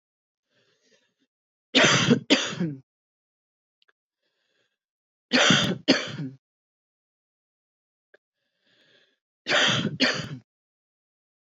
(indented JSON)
{
  "three_cough_length": "11.4 s",
  "three_cough_amplitude": 21376,
  "three_cough_signal_mean_std_ratio": 0.34,
  "survey_phase": "beta (2021-08-13 to 2022-03-07)",
  "age": "45-64",
  "gender": "Female",
  "wearing_mask": "No",
  "symptom_cough_any": true,
  "symptom_shortness_of_breath": true,
  "symptom_sore_throat": true,
  "symptom_fatigue": true,
  "symptom_fever_high_temperature": true,
  "symptom_headache": true,
  "symptom_change_to_sense_of_smell_or_taste": true,
  "symptom_loss_of_taste": true,
  "symptom_onset": "4 days",
  "smoker_status": "Ex-smoker",
  "respiratory_condition_asthma": false,
  "respiratory_condition_other": false,
  "recruitment_source": "Test and Trace",
  "submission_delay": "2 days",
  "covid_test_result": "Positive",
  "covid_test_method": "RT-qPCR",
  "covid_ct_value": 25.3,
  "covid_ct_gene": "ORF1ab gene",
  "covid_ct_mean": 25.7,
  "covid_viral_load": "3600 copies/ml",
  "covid_viral_load_category": "Minimal viral load (< 10K copies/ml)"
}